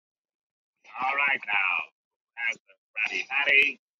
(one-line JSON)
{"exhalation_length": "4.0 s", "exhalation_amplitude": 14549, "exhalation_signal_mean_std_ratio": 0.49, "survey_phase": "beta (2021-08-13 to 2022-03-07)", "age": "18-44", "gender": "Male", "wearing_mask": "No", "symptom_cough_any": true, "symptom_new_continuous_cough": true, "symptom_runny_or_blocked_nose": true, "symptom_sore_throat": true, "symptom_fatigue": true, "symptom_fever_high_temperature": true, "symptom_headache": true, "smoker_status": "Never smoked", "respiratory_condition_asthma": false, "respiratory_condition_other": false, "recruitment_source": "Test and Trace", "submission_delay": "2 days", "covid_test_result": "Positive", "covid_test_method": "RT-qPCR"}